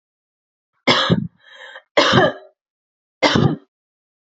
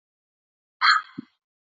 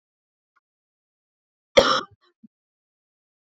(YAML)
three_cough_length: 4.3 s
three_cough_amplitude: 32767
three_cough_signal_mean_std_ratio: 0.4
exhalation_length: 1.8 s
exhalation_amplitude: 20122
exhalation_signal_mean_std_ratio: 0.27
cough_length: 3.5 s
cough_amplitude: 28411
cough_signal_mean_std_ratio: 0.18
survey_phase: beta (2021-08-13 to 2022-03-07)
age: 18-44
gender: Female
wearing_mask: 'No'
symptom_cough_any: true
symptom_runny_or_blocked_nose: true
symptom_onset: 3 days
smoker_status: Ex-smoker
respiratory_condition_asthma: true
respiratory_condition_other: false
recruitment_source: Test and Trace
submission_delay: 2 days
covid_test_result: Positive
covid_test_method: RT-qPCR
covid_ct_value: 22.8
covid_ct_gene: N gene